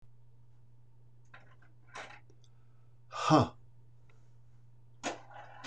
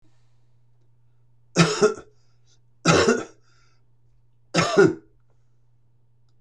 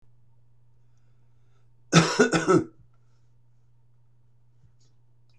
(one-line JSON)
{"exhalation_length": "5.7 s", "exhalation_amplitude": 8214, "exhalation_signal_mean_std_ratio": 0.34, "three_cough_length": "6.4 s", "three_cough_amplitude": 23935, "three_cough_signal_mean_std_ratio": 0.34, "cough_length": "5.4 s", "cough_amplitude": 20507, "cough_signal_mean_std_ratio": 0.29, "survey_phase": "beta (2021-08-13 to 2022-03-07)", "age": "65+", "gender": "Male", "wearing_mask": "No", "symptom_none": true, "smoker_status": "Ex-smoker", "respiratory_condition_asthma": false, "respiratory_condition_other": false, "recruitment_source": "REACT", "submission_delay": "1 day", "covid_test_result": "Negative", "covid_test_method": "RT-qPCR", "influenza_a_test_result": "Negative", "influenza_b_test_result": "Negative"}